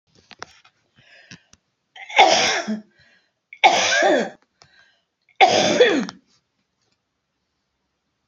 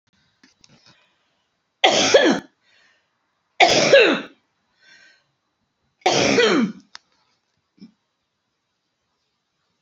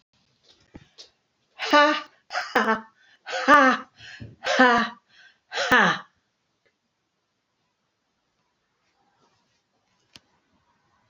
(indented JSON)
{
  "cough_length": "8.3 s",
  "cough_amplitude": 29448,
  "cough_signal_mean_std_ratio": 0.38,
  "three_cough_length": "9.8 s",
  "three_cough_amplitude": 32668,
  "three_cough_signal_mean_std_ratio": 0.34,
  "exhalation_length": "11.1 s",
  "exhalation_amplitude": 26032,
  "exhalation_signal_mean_std_ratio": 0.31,
  "survey_phase": "alpha (2021-03-01 to 2021-08-12)",
  "age": "45-64",
  "gender": "Female",
  "wearing_mask": "No",
  "symptom_cough_any": true,
  "symptom_abdominal_pain": true,
  "symptom_onset": "12 days",
  "smoker_status": "Ex-smoker",
  "respiratory_condition_asthma": true,
  "respiratory_condition_other": false,
  "recruitment_source": "REACT",
  "submission_delay": "10 days",
  "covid_test_result": "Negative",
  "covid_test_method": "RT-qPCR"
}